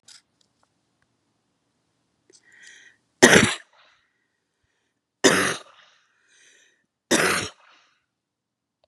{"three_cough_length": "8.9 s", "three_cough_amplitude": 32768, "three_cough_signal_mean_std_ratio": 0.24, "survey_phase": "beta (2021-08-13 to 2022-03-07)", "age": "65+", "gender": "Female", "wearing_mask": "No", "symptom_none": true, "symptom_onset": "12 days", "smoker_status": "Ex-smoker", "respiratory_condition_asthma": false, "respiratory_condition_other": false, "recruitment_source": "REACT", "submission_delay": "1 day", "covid_test_result": "Negative", "covid_test_method": "RT-qPCR", "influenza_a_test_result": "Negative", "influenza_b_test_result": "Negative"}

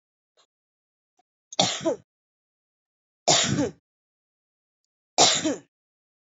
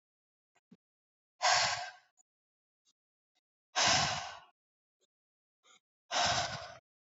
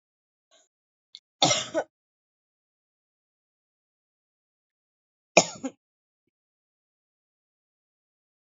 {"three_cough_length": "6.2 s", "three_cough_amplitude": 20443, "three_cough_signal_mean_std_ratio": 0.31, "exhalation_length": "7.2 s", "exhalation_amplitude": 5410, "exhalation_signal_mean_std_ratio": 0.35, "cough_length": "8.5 s", "cough_amplitude": 26662, "cough_signal_mean_std_ratio": 0.15, "survey_phase": "alpha (2021-03-01 to 2021-08-12)", "age": "18-44", "gender": "Female", "wearing_mask": "No", "symptom_cough_any": true, "symptom_diarrhoea": true, "symptom_fever_high_temperature": true, "symptom_headache": true, "symptom_onset": "7 days", "smoker_status": "Never smoked", "respiratory_condition_asthma": false, "respiratory_condition_other": false, "recruitment_source": "Test and Trace", "submission_delay": "2 days", "covid_test_result": "Positive", "covid_test_method": "RT-qPCR"}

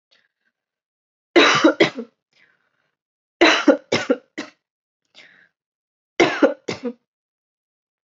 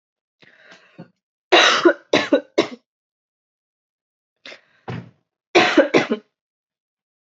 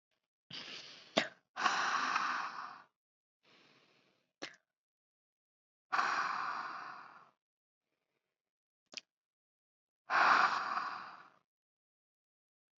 {"three_cough_length": "8.1 s", "three_cough_amplitude": 29923, "three_cough_signal_mean_std_ratio": 0.31, "cough_length": "7.3 s", "cough_amplitude": 29220, "cough_signal_mean_std_ratio": 0.32, "exhalation_length": "12.8 s", "exhalation_amplitude": 8376, "exhalation_signal_mean_std_ratio": 0.37, "survey_phase": "beta (2021-08-13 to 2022-03-07)", "age": "18-44", "gender": "Female", "wearing_mask": "No", "symptom_cough_any": true, "symptom_runny_or_blocked_nose": true, "symptom_sore_throat": true, "symptom_fatigue": true, "symptom_onset": "5 days", "smoker_status": "Never smoked", "respiratory_condition_asthma": false, "respiratory_condition_other": false, "recruitment_source": "Test and Trace", "submission_delay": "1 day", "covid_test_result": "Positive", "covid_test_method": "RT-qPCR", "covid_ct_value": 21.6, "covid_ct_gene": "N gene"}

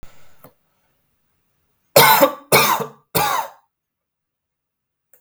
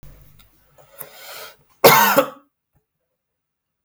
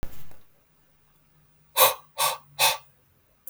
{"three_cough_length": "5.2 s", "three_cough_amplitude": 32768, "three_cough_signal_mean_std_ratio": 0.34, "cough_length": "3.8 s", "cough_amplitude": 32768, "cough_signal_mean_std_ratio": 0.28, "exhalation_length": "3.5 s", "exhalation_amplitude": 26913, "exhalation_signal_mean_std_ratio": 0.38, "survey_phase": "beta (2021-08-13 to 2022-03-07)", "age": "18-44", "gender": "Male", "wearing_mask": "No", "symptom_none": true, "symptom_onset": "6 days", "smoker_status": "Never smoked", "respiratory_condition_asthma": false, "respiratory_condition_other": false, "recruitment_source": "REACT", "submission_delay": "1 day", "covid_test_result": "Negative", "covid_test_method": "RT-qPCR"}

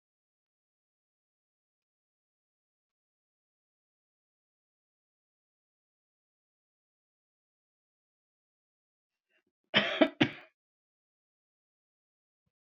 {"cough_length": "12.6 s", "cough_amplitude": 11879, "cough_signal_mean_std_ratio": 0.12, "survey_phase": "beta (2021-08-13 to 2022-03-07)", "age": "65+", "gender": "Female", "wearing_mask": "No", "symptom_runny_or_blocked_nose": true, "smoker_status": "Never smoked", "respiratory_condition_asthma": false, "respiratory_condition_other": false, "recruitment_source": "REACT", "submission_delay": "1 day", "covid_test_result": "Negative", "covid_test_method": "RT-qPCR"}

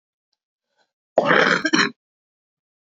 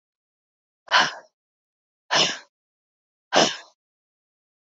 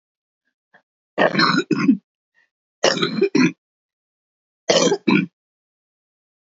{"cough_length": "3.0 s", "cough_amplitude": 26327, "cough_signal_mean_std_ratio": 0.35, "exhalation_length": "4.8 s", "exhalation_amplitude": 25032, "exhalation_signal_mean_std_ratio": 0.28, "three_cough_length": "6.5 s", "three_cough_amplitude": 30221, "three_cough_signal_mean_std_ratio": 0.41, "survey_phase": "beta (2021-08-13 to 2022-03-07)", "age": "45-64", "gender": "Female", "wearing_mask": "No", "symptom_cough_any": true, "symptom_runny_or_blocked_nose": true, "symptom_sore_throat": true, "symptom_diarrhoea": true, "symptom_fatigue": true, "symptom_fever_high_temperature": true, "symptom_headache": true, "smoker_status": "Never smoked", "respiratory_condition_asthma": false, "respiratory_condition_other": false, "recruitment_source": "Test and Trace", "submission_delay": "2 days", "covid_test_result": "Positive", "covid_test_method": "LFT"}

